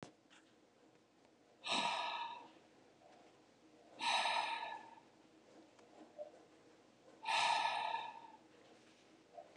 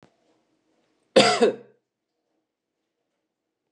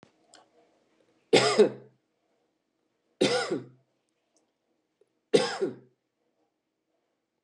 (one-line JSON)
{"exhalation_length": "9.6 s", "exhalation_amplitude": 2285, "exhalation_signal_mean_std_ratio": 0.47, "cough_length": "3.7 s", "cough_amplitude": 24860, "cough_signal_mean_std_ratio": 0.24, "three_cough_length": "7.4 s", "three_cough_amplitude": 15826, "three_cough_signal_mean_std_ratio": 0.27, "survey_phase": "beta (2021-08-13 to 2022-03-07)", "age": "45-64", "gender": "Male", "wearing_mask": "No", "symptom_none": true, "smoker_status": "Ex-smoker", "respiratory_condition_asthma": false, "respiratory_condition_other": false, "recruitment_source": "REACT", "submission_delay": "1 day", "covid_test_result": "Negative", "covid_test_method": "RT-qPCR", "influenza_a_test_result": "Negative", "influenza_b_test_result": "Negative"}